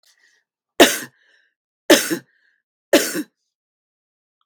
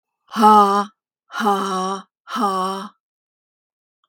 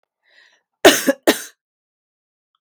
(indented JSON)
{
  "three_cough_length": "4.5 s",
  "three_cough_amplitude": 32768,
  "three_cough_signal_mean_std_ratio": 0.26,
  "exhalation_length": "4.1 s",
  "exhalation_amplitude": 32106,
  "exhalation_signal_mean_std_ratio": 0.46,
  "cough_length": "2.6 s",
  "cough_amplitude": 32768,
  "cough_signal_mean_std_ratio": 0.25,
  "survey_phase": "beta (2021-08-13 to 2022-03-07)",
  "age": "65+",
  "gender": "Female",
  "wearing_mask": "No",
  "symptom_none": true,
  "smoker_status": "Ex-smoker",
  "respiratory_condition_asthma": false,
  "respiratory_condition_other": false,
  "recruitment_source": "REACT",
  "submission_delay": "2 days",
  "covid_test_result": "Negative",
  "covid_test_method": "RT-qPCR",
  "influenza_a_test_result": "Negative",
  "influenza_b_test_result": "Negative"
}